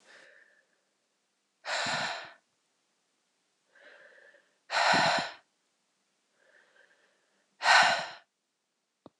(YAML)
exhalation_length: 9.2 s
exhalation_amplitude: 13507
exhalation_signal_mean_std_ratio: 0.31
survey_phase: beta (2021-08-13 to 2022-03-07)
age: 45-64
gender: Female
wearing_mask: 'No'
symptom_runny_or_blocked_nose: true
symptom_shortness_of_breath: true
symptom_abdominal_pain: true
symptom_diarrhoea: true
symptom_fatigue: true
symptom_loss_of_taste: true
symptom_other: true
symptom_onset: 4 days
smoker_status: Never smoked
respiratory_condition_asthma: false
respiratory_condition_other: false
recruitment_source: Test and Trace
submission_delay: 2 days
covid_test_result: Positive
covid_test_method: RT-qPCR
covid_ct_value: 10.0
covid_ct_gene: ORF1ab gene